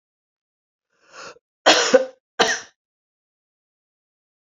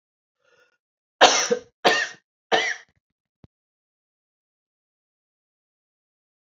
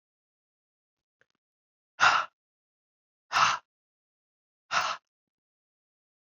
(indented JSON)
{
  "cough_length": "4.4 s",
  "cough_amplitude": 29881,
  "cough_signal_mean_std_ratio": 0.26,
  "three_cough_length": "6.5 s",
  "three_cough_amplitude": 29883,
  "three_cough_signal_mean_std_ratio": 0.24,
  "exhalation_length": "6.2 s",
  "exhalation_amplitude": 13166,
  "exhalation_signal_mean_std_ratio": 0.25,
  "survey_phase": "beta (2021-08-13 to 2022-03-07)",
  "age": "65+",
  "gender": "Female",
  "wearing_mask": "No",
  "symptom_cough_any": true,
  "symptom_new_continuous_cough": true,
  "symptom_runny_or_blocked_nose": true,
  "symptom_fatigue": true,
  "symptom_headache": true,
  "symptom_other": true,
  "symptom_onset": "3 days",
  "smoker_status": "Never smoked",
  "respiratory_condition_asthma": false,
  "respiratory_condition_other": false,
  "recruitment_source": "Test and Trace",
  "submission_delay": "2 days",
  "covid_test_result": "Positive",
  "covid_test_method": "RT-qPCR",
  "covid_ct_value": 18.9,
  "covid_ct_gene": "ORF1ab gene",
  "covid_ct_mean": 19.7,
  "covid_viral_load": "330000 copies/ml",
  "covid_viral_load_category": "Low viral load (10K-1M copies/ml)"
}